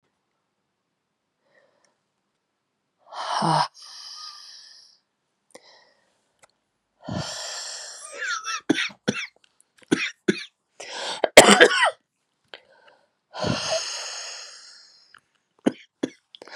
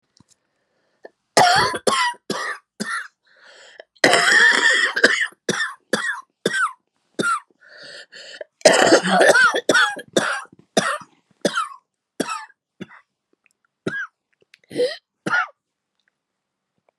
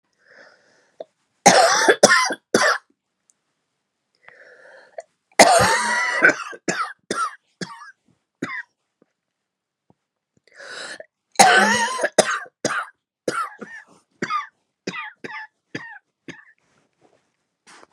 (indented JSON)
{
  "exhalation_length": "16.6 s",
  "exhalation_amplitude": 32768,
  "exhalation_signal_mean_std_ratio": 0.28,
  "cough_length": "17.0 s",
  "cough_amplitude": 32768,
  "cough_signal_mean_std_ratio": 0.45,
  "three_cough_length": "17.9 s",
  "three_cough_amplitude": 32768,
  "three_cough_signal_mean_std_ratio": 0.36,
  "survey_phase": "beta (2021-08-13 to 2022-03-07)",
  "age": "18-44",
  "gender": "Female",
  "wearing_mask": "No",
  "symptom_cough_any": true,
  "symptom_shortness_of_breath": true,
  "symptom_sore_throat": true,
  "symptom_abdominal_pain": true,
  "symptom_fatigue": true,
  "symptom_headache": true,
  "symptom_change_to_sense_of_smell_or_taste": true,
  "symptom_loss_of_taste": true,
  "smoker_status": "Never smoked",
  "respiratory_condition_asthma": true,
  "respiratory_condition_other": false,
  "recruitment_source": "Test and Trace",
  "submission_delay": "-2 days",
  "covid_test_result": "Negative",
  "covid_test_method": "LFT"
}